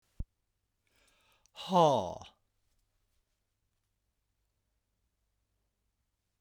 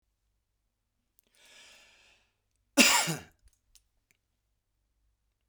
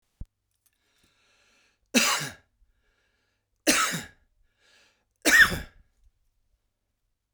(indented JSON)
{
  "exhalation_length": "6.4 s",
  "exhalation_amplitude": 7413,
  "exhalation_signal_mean_std_ratio": 0.2,
  "cough_length": "5.5 s",
  "cough_amplitude": 14796,
  "cough_signal_mean_std_ratio": 0.2,
  "three_cough_length": "7.3 s",
  "three_cough_amplitude": 18157,
  "three_cough_signal_mean_std_ratio": 0.27,
  "survey_phase": "beta (2021-08-13 to 2022-03-07)",
  "age": "45-64",
  "gender": "Male",
  "wearing_mask": "No",
  "symptom_none": true,
  "smoker_status": "Ex-smoker",
  "respiratory_condition_asthma": false,
  "respiratory_condition_other": false,
  "recruitment_source": "REACT",
  "submission_delay": "1 day",
  "covid_test_result": "Negative",
  "covid_test_method": "RT-qPCR"
}